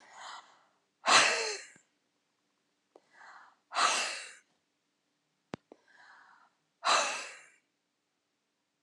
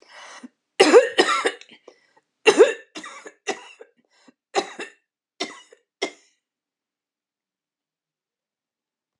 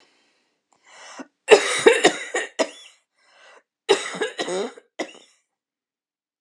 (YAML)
exhalation_length: 8.8 s
exhalation_amplitude: 11657
exhalation_signal_mean_std_ratio: 0.31
three_cough_length: 9.2 s
three_cough_amplitude: 30060
three_cough_signal_mean_std_ratio: 0.25
cough_length: 6.4 s
cough_amplitude: 32722
cough_signal_mean_std_ratio: 0.31
survey_phase: alpha (2021-03-01 to 2021-08-12)
age: 65+
gender: Female
wearing_mask: 'No'
symptom_none: true
smoker_status: Never smoked
respiratory_condition_asthma: false
respiratory_condition_other: false
recruitment_source: REACT
submission_delay: 1 day
covid_test_result: Negative
covid_test_method: RT-qPCR